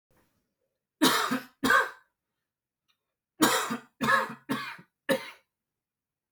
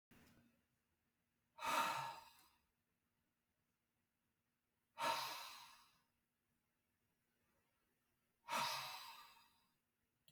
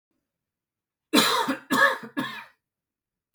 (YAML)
three_cough_length: 6.3 s
three_cough_amplitude: 13398
three_cough_signal_mean_std_ratio: 0.39
exhalation_length: 10.3 s
exhalation_amplitude: 1454
exhalation_signal_mean_std_ratio: 0.33
cough_length: 3.3 s
cough_amplitude: 20087
cough_signal_mean_std_ratio: 0.39
survey_phase: alpha (2021-03-01 to 2021-08-12)
age: 18-44
gender: Male
wearing_mask: 'No'
symptom_cough_any: true
symptom_fatigue: true
symptom_change_to_sense_of_smell_or_taste: true
symptom_loss_of_taste: true
symptom_onset: 4 days
smoker_status: Never smoked
respiratory_condition_asthma: false
respiratory_condition_other: false
recruitment_source: Test and Trace
submission_delay: 2 days
covid_test_result: Positive
covid_test_method: RT-qPCR